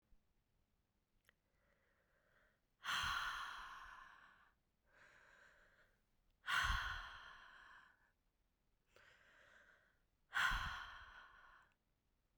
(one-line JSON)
{"exhalation_length": "12.4 s", "exhalation_amplitude": 1520, "exhalation_signal_mean_std_ratio": 0.37, "survey_phase": "beta (2021-08-13 to 2022-03-07)", "age": "18-44", "gender": "Female", "wearing_mask": "No", "symptom_runny_or_blocked_nose": true, "symptom_shortness_of_breath": true, "symptom_sore_throat": true, "symptom_fatigue": true, "symptom_headache": true, "symptom_change_to_sense_of_smell_or_taste": true, "symptom_loss_of_taste": true, "symptom_onset": "4 days", "smoker_status": "Never smoked", "respiratory_condition_asthma": true, "respiratory_condition_other": false, "recruitment_source": "Test and Trace", "submission_delay": "3 days", "covid_test_method": "RT-qPCR"}